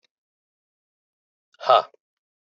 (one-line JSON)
{"exhalation_length": "2.6 s", "exhalation_amplitude": 20855, "exhalation_signal_mean_std_ratio": 0.18, "survey_phase": "beta (2021-08-13 to 2022-03-07)", "age": "65+", "gender": "Male", "wearing_mask": "No", "symptom_cough_any": true, "symptom_runny_or_blocked_nose": true, "symptom_headache": true, "smoker_status": "Ex-smoker", "respiratory_condition_asthma": false, "respiratory_condition_other": false, "recruitment_source": "REACT", "submission_delay": "1 day", "covid_test_result": "Negative", "covid_test_method": "RT-qPCR"}